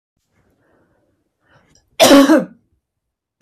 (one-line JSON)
{"cough_length": "3.4 s", "cough_amplitude": 32768, "cough_signal_mean_std_ratio": 0.3, "survey_phase": "beta (2021-08-13 to 2022-03-07)", "age": "18-44", "gender": "Female", "wearing_mask": "No", "symptom_runny_or_blocked_nose": true, "symptom_sore_throat": true, "smoker_status": "Ex-smoker", "respiratory_condition_asthma": false, "respiratory_condition_other": false, "recruitment_source": "REACT", "submission_delay": "2 days", "covid_test_result": "Negative", "covid_test_method": "RT-qPCR", "influenza_a_test_result": "Negative", "influenza_b_test_result": "Negative"}